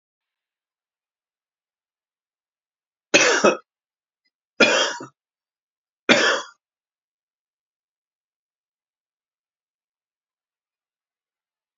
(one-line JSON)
{"three_cough_length": "11.8 s", "three_cough_amplitude": 32767, "three_cough_signal_mean_std_ratio": 0.23, "survey_phase": "beta (2021-08-13 to 2022-03-07)", "age": "65+", "gender": "Male", "wearing_mask": "No", "symptom_cough_any": true, "symptom_runny_or_blocked_nose": true, "smoker_status": "Never smoked", "respiratory_condition_asthma": true, "respiratory_condition_other": false, "recruitment_source": "REACT", "submission_delay": "1 day", "covid_test_result": "Negative", "covid_test_method": "RT-qPCR", "influenza_a_test_result": "Negative", "influenza_b_test_result": "Negative"}